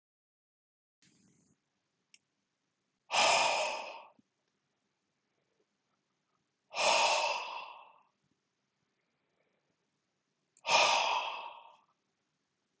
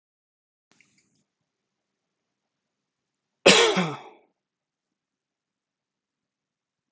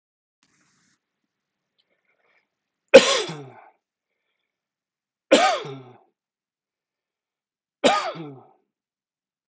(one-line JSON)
{"exhalation_length": "12.8 s", "exhalation_amplitude": 6449, "exhalation_signal_mean_std_ratio": 0.34, "cough_length": "6.9 s", "cough_amplitude": 24103, "cough_signal_mean_std_ratio": 0.19, "three_cough_length": "9.5 s", "three_cough_amplitude": 32768, "three_cough_signal_mean_std_ratio": 0.21, "survey_phase": "beta (2021-08-13 to 2022-03-07)", "age": "45-64", "gender": "Male", "wearing_mask": "No", "symptom_none": true, "smoker_status": "Ex-smoker", "respiratory_condition_asthma": false, "respiratory_condition_other": false, "recruitment_source": "REACT", "submission_delay": "2 days", "covid_test_result": "Negative", "covid_test_method": "RT-qPCR"}